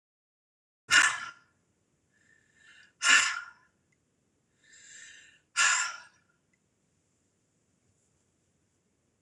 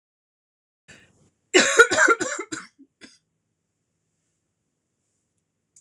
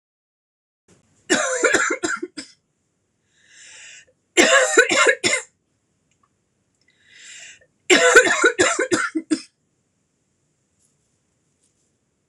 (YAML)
exhalation_length: 9.2 s
exhalation_amplitude: 14671
exhalation_signal_mean_std_ratio: 0.26
cough_length: 5.8 s
cough_amplitude: 26028
cough_signal_mean_std_ratio: 0.26
three_cough_length: 12.3 s
three_cough_amplitude: 26028
three_cough_signal_mean_std_ratio: 0.37
survey_phase: beta (2021-08-13 to 2022-03-07)
age: 45-64
gender: Female
wearing_mask: 'No'
symptom_cough_any: true
symptom_runny_or_blocked_nose: true
symptom_diarrhoea: true
symptom_fatigue: true
symptom_change_to_sense_of_smell_or_taste: true
symptom_onset: 10 days
smoker_status: Never smoked
respiratory_condition_asthma: true
respiratory_condition_other: false
recruitment_source: REACT
submission_delay: 0 days
covid_test_method: RT-qPCR
influenza_a_test_result: Negative
influenza_b_test_result: Negative